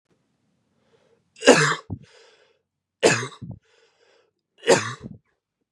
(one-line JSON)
{"three_cough_length": "5.7 s", "three_cough_amplitude": 32767, "three_cough_signal_mean_std_ratio": 0.27, "survey_phase": "beta (2021-08-13 to 2022-03-07)", "age": "18-44", "gender": "Male", "wearing_mask": "No", "symptom_runny_or_blocked_nose": true, "symptom_fatigue": true, "symptom_change_to_sense_of_smell_or_taste": true, "smoker_status": "Never smoked", "respiratory_condition_asthma": true, "respiratory_condition_other": false, "recruitment_source": "Test and Trace", "submission_delay": "1 day", "covid_test_result": "Positive", "covid_test_method": "RT-qPCR"}